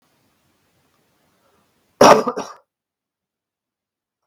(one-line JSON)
{"cough_length": "4.3 s", "cough_amplitude": 32768, "cough_signal_mean_std_ratio": 0.2, "survey_phase": "beta (2021-08-13 to 2022-03-07)", "age": "18-44", "gender": "Male", "wearing_mask": "No", "symptom_none": true, "smoker_status": "Never smoked", "respiratory_condition_asthma": false, "respiratory_condition_other": false, "recruitment_source": "REACT", "submission_delay": "2 days", "covid_test_result": "Negative", "covid_test_method": "RT-qPCR"}